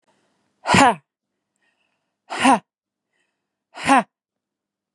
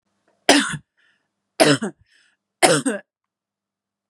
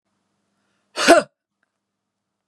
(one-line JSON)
{"exhalation_length": "4.9 s", "exhalation_amplitude": 32310, "exhalation_signal_mean_std_ratio": 0.29, "three_cough_length": "4.1 s", "three_cough_amplitude": 32767, "three_cough_signal_mean_std_ratio": 0.33, "cough_length": "2.5 s", "cough_amplitude": 32767, "cough_signal_mean_std_ratio": 0.23, "survey_phase": "beta (2021-08-13 to 2022-03-07)", "age": "45-64", "gender": "Female", "wearing_mask": "No", "symptom_none": true, "smoker_status": "Never smoked", "respiratory_condition_asthma": false, "respiratory_condition_other": false, "recruitment_source": "REACT", "submission_delay": "1 day", "covid_test_result": "Negative", "covid_test_method": "RT-qPCR", "influenza_a_test_result": "Negative", "influenza_b_test_result": "Negative"}